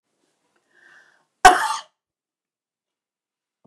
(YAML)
cough_length: 3.7 s
cough_amplitude: 29204
cough_signal_mean_std_ratio: 0.18
survey_phase: beta (2021-08-13 to 2022-03-07)
age: 65+
gender: Female
wearing_mask: 'No'
symptom_runny_or_blocked_nose: true
symptom_headache: true
symptom_onset: 13 days
smoker_status: Never smoked
respiratory_condition_asthma: false
respiratory_condition_other: false
recruitment_source: REACT
submission_delay: 1 day
covid_test_result: Negative
covid_test_method: RT-qPCR
influenza_a_test_result: Unknown/Void
influenza_b_test_result: Unknown/Void